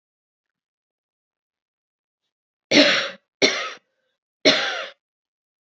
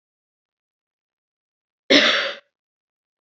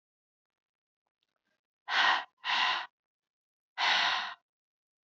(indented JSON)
{
  "three_cough_length": "5.6 s",
  "three_cough_amplitude": 28084,
  "three_cough_signal_mean_std_ratio": 0.3,
  "cough_length": "3.2 s",
  "cough_amplitude": 30567,
  "cough_signal_mean_std_ratio": 0.26,
  "exhalation_length": "5.0 s",
  "exhalation_amplitude": 6611,
  "exhalation_signal_mean_std_ratio": 0.4,
  "survey_phase": "beta (2021-08-13 to 2022-03-07)",
  "age": "18-44",
  "gender": "Female",
  "wearing_mask": "No",
  "symptom_runny_or_blocked_nose": true,
  "symptom_shortness_of_breath": true,
  "symptom_sore_throat": true,
  "symptom_fatigue": true,
  "symptom_fever_high_temperature": true,
  "symptom_headache": true,
  "symptom_change_to_sense_of_smell_or_taste": true,
  "symptom_loss_of_taste": true,
  "symptom_other": true,
  "symptom_onset": "2 days",
  "smoker_status": "Ex-smoker",
  "respiratory_condition_asthma": false,
  "respiratory_condition_other": false,
  "recruitment_source": "Test and Trace",
  "submission_delay": "2 days",
  "covid_test_result": "Positive",
  "covid_test_method": "RT-qPCR",
  "covid_ct_value": 16.2,
  "covid_ct_gene": "ORF1ab gene",
  "covid_ct_mean": 16.5,
  "covid_viral_load": "4000000 copies/ml",
  "covid_viral_load_category": "High viral load (>1M copies/ml)"
}